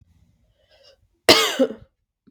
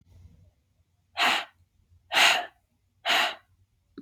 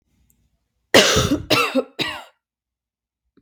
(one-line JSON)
{"cough_length": "2.3 s", "cough_amplitude": 32768, "cough_signal_mean_std_ratio": 0.29, "exhalation_length": "4.0 s", "exhalation_amplitude": 14192, "exhalation_signal_mean_std_ratio": 0.37, "three_cough_length": "3.4 s", "three_cough_amplitude": 32767, "three_cough_signal_mean_std_ratio": 0.39, "survey_phase": "beta (2021-08-13 to 2022-03-07)", "age": "18-44", "gender": "Female", "wearing_mask": "No", "symptom_cough_any": true, "symptom_new_continuous_cough": true, "symptom_runny_or_blocked_nose": true, "symptom_sore_throat": true, "symptom_headache": true, "symptom_change_to_sense_of_smell_or_taste": true, "symptom_onset": "2 days", "smoker_status": "Never smoked", "respiratory_condition_asthma": false, "respiratory_condition_other": false, "recruitment_source": "Test and Trace", "submission_delay": "2 days", "covid_test_result": "Positive", "covid_test_method": "RT-qPCR", "covid_ct_value": 19.0, "covid_ct_gene": "ORF1ab gene"}